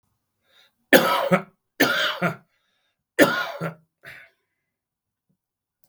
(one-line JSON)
{"three_cough_length": "5.9 s", "three_cough_amplitude": 32768, "three_cough_signal_mean_std_ratio": 0.34, "survey_phase": "beta (2021-08-13 to 2022-03-07)", "age": "65+", "gender": "Male", "wearing_mask": "No", "symptom_cough_any": true, "smoker_status": "Current smoker (11 or more cigarettes per day)", "respiratory_condition_asthma": false, "respiratory_condition_other": false, "recruitment_source": "REACT", "submission_delay": "6 days", "covid_test_result": "Negative", "covid_test_method": "RT-qPCR", "influenza_a_test_result": "Negative", "influenza_b_test_result": "Negative"}